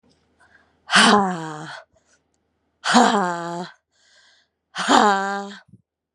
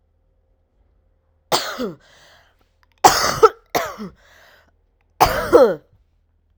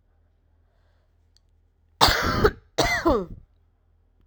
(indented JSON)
{
  "exhalation_length": "6.1 s",
  "exhalation_amplitude": 32767,
  "exhalation_signal_mean_std_ratio": 0.41,
  "three_cough_length": "6.6 s",
  "three_cough_amplitude": 32768,
  "three_cough_signal_mean_std_ratio": 0.31,
  "cough_length": "4.3 s",
  "cough_amplitude": 32768,
  "cough_signal_mean_std_ratio": 0.37,
  "survey_phase": "alpha (2021-03-01 to 2021-08-12)",
  "age": "18-44",
  "gender": "Female",
  "wearing_mask": "No",
  "symptom_cough_any": true,
  "symptom_new_continuous_cough": true,
  "symptom_shortness_of_breath": true,
  "symptom_diarrhoea": true,
  "symptom_fatigue": true,
  "symptom_headache": true,
  "symptom_change_to_sense_of_smell_or_taste": true,
  "symptom_onset": "6 days",
  "smoker_status": "Ex-smoker",
  "respiratory_condition_asthma": false,
  "respiratory_condition_other": false,
  "recruitment_source": "Test and Trace",
  "submission_delay": "1 day",
  "covid_test_result": "Positive",
  "covid_test_method": "RT-qPCR"
}